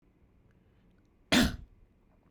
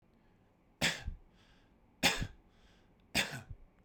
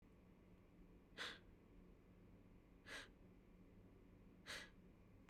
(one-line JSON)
{"cough_length": "2.3 s", "cough_amplitude": 7966, "cough_signal_mean_std_ratio": 0.27, "three_cough_length": "3.8 s", "three_cough_amplitude": 5523, "three_cough_signal_mean_std_ratio": 0.35, "exhalation_length": "5.3 s", "exhalation_amplitude": 405, "exhalation_signal_mean_std_ratio": 0.74, "survey_phase": "beta (2021-08-13 to 2022-03-07)", "age": "18-44", "gender": "Male", "wearing_mask": "No", "symptom_none": true, "smoker_status": "Never smoked", "respiratory_condition_asthma": false, "respiratory_condition_other": false, "recruitment_source": "Test and Trace", "submission_delay": "1 day", "covid_test_result": "Negative", "covid_test_method": "RT-qPCR"}